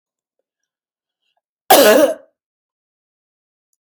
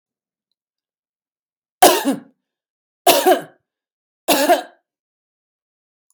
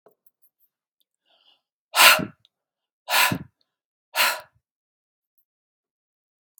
cough_length: 3.8 s
cough_amplitude: 32768
cough_signal_mean_std_ratio: 0.28
three_cough_length: 6.1 s
three_cough_amplitude: 32768
three_cough_signal_mean_std_ratio: 0.3
exhalation_length: 6.6 s
exhalation_amplitude: 32768
exhalation_signal_mean_std_ratio: 0.24
survey_phase: beta (2021-08-13 to 2022-03-07)
age: 45-64
gender: Female
wearing_mask: 'No'
symptom_none: true
smoker_status: Never smoked
respiratory_condition_asthma: false
respiratory_condition_other: false
recruitment_source: REACT
submission_delay: 1 day
covid_test_result: Negative
covid_test_method: RT-qPCR
influenza_a_test_result: Unknown/Void
influenza_b_test_result: Unknown/Void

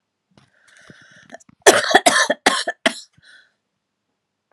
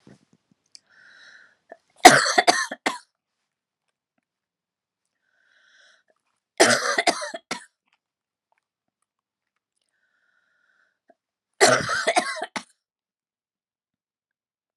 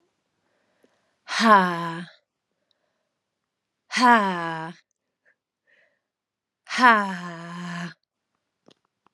cough_length: 4.5 s
cough_amplitude: 32768
cough_signal_mean_std_ratio: 0.3
three_cough_length: 14.8 s
three_cough_amplitude: 32768
three_cough_signal_mean_std_ratio: 0.23
exhalation_length: 9.1 s
exhalation_amplitude: 29311
exhalation_signal_mean_std_ratio: 0.32
survey_phase: beta (2021-08-13 to 2022-03-07)
age: 45-64
gender: Female
wearing_mask: 'No'
symptom_new_continuous_cough: true
symptom_runny_or_blocked_nose: true
symptom_sore_throat: true
symptom_fatigue: true
smoker_status: Never smoked
respiratory_condition_asthma: false
respiratory_condition_other: false
recruitment_source: Test and Trace
submission_delay: 2 days
covid_test_result: Positive
covid_test_method: LFT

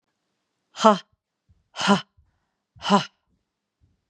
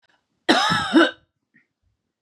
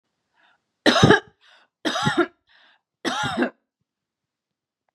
exhalation_length: 4.1 s
exhalation_amplitude: 30244
exhalation_signal_mean_std_ratio: 0.25
cough_length: 2.2 s
cough_amplitude: 29312
cough_signal_mean_std_ratio: 0.4
three_cough_length: 4.9 s
three_cough_amplitude: 31942
three_cough_signal_mean_std_ratio: 0.34
survey_phase: beta (2021-08-13 to 2022-03-07)
age: 18-44
gender: Female
wearing_mask: 'No'
symptom_none: true
smoker_status: Never smoked
respiratory_condition_asthma: false
respiratory_condition_other: false
recruitment_source: Test and Trace
submission_delay: 1 day
covid_test_result: Negative
covid_test_method: RT-qPCR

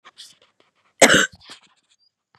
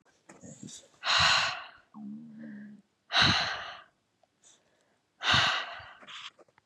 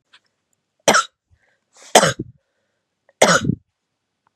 cough_length: 2.4 s
cough_amplitude: 32768
cough_signal_mean_std_ratio: 0.25
exhalation_length: 6.7 s
exhalation_amplitude: 10966
exhalation_signal_mean_std_ratio: 0.44
three_cough_length: 4.4 s
three_cough_amplitude: 32768
three_cough_signal_mean_std_ratio: 0.28
survey_phase: beta (2021-08-13 to 2022-03-07)
age: 18-44
gender: Female
wearing_mask: 'No'
symptom_cough_any: true
symptom_runny_or_blocked_nose: true
symptom_fatigue: true
symptom_onset: 3 days
smoker_status: Never smoked
respiratory_condition_asthma: true
respiratory_condition_other: false
recruitment_source: Test and Trace
submission_delay: 1 day
covid_test_result: Positive
covid_test_method: RT-qPCR
covid_ct_value: 22.6
covid_ct_gene: N gene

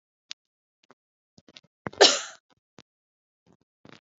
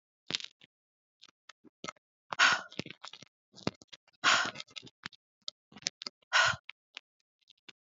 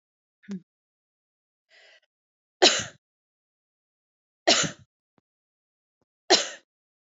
cough_length: 4.2 s
cough_amplitude: 24798
cough_signal_mean_std_ratio: 0.16
exhalation_length: 7.9 s
exhalation_amplitude: 14694
exhalation_signal_mean_std_ratio: 0.26
three_cough_length: 7.2 s
three_cough_amplitude: 25584
three_cough_signal_mean_std_ratio: 0.21
survey_phase: beta (2021-08-13 to 2022-03-07)
age: 18-44
gender: Female
wearing_mask: 'No'
symptom_runny_or_blocked_nose: true
symptom_onset: 8 days
smoker_status: Never smoked
respiratory_condition_asthma: false
respiratory_condition_other: false
recruitment_source: REACT
submission_delay: 0 days
covid_test_result: Negative
covid_test_method: RT-qPCR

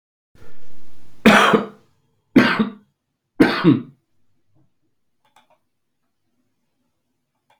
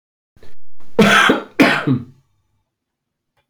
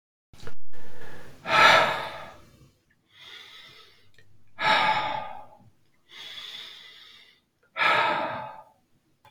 three_cough_length: 7.6 s
three_cough_amplitude: 32324
three_cough_signal_mean_std_ratio: 0.38
cough_length: 3.5 s
cough_amplitude: 30840
cough_signal_mean_std_ratio: 0.54
exhalation_length: 9.3 s
exhalation_amplitude: 23468
exhalation_signal_mean_std_ratio: 0.51
survey_phase: beta (2021-08-13 to 2022-03-07)
age: 45-64
gender: Male
wearing_mask: 'No'
symptom_cough_any: true
symptom_new_continuous_cough: true
symptom_runny_or_blocked_nose: true
symptom_sore_throat: true
symptom_fatigue: true
symptom_fever_high_temperature: true
symptom_headache: true
symptom_change_to_sense_of_smell_or_taste: true
symptom_loss_of_taste: true
symptom_onset: 4 days
smoker_status: Never smoked
respiratory_condition_asthma: false
respiratory_condition_other: false
recruitment_source: Test and Trace
submission_delay: 2 days
covid_test_result: Positive
covid_test_method: RT-qPCR
covid_ct_value: 16.7
covid_ct_gene: ORF1ab gene
covid_ct_mean: 17.0
covid_viral_load: 2600000 copies/ml
covid_viral_load_category: High viral load (>1M copies/ml)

